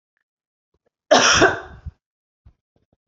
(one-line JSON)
{"cough_length": "3.1 s", "cough_amplitude": 28622, "cough_signal_mean_std_ratio": 0.31, "survey_phase": "beta (2021-08-13 to 2022-03-07)", "age": "18-44", "gender": "Female", "wearing_mask": "No", "symptom_none": true, "smoker_status": "Never smoked", "respiratory_condition_asthma": false, "respiratory_condition_other": false, "recruitment_source": "Test and Trace", "submission_delay": "2 days", "covid_test_result": "Negative", "covid_test_method": "RT-qPCR"}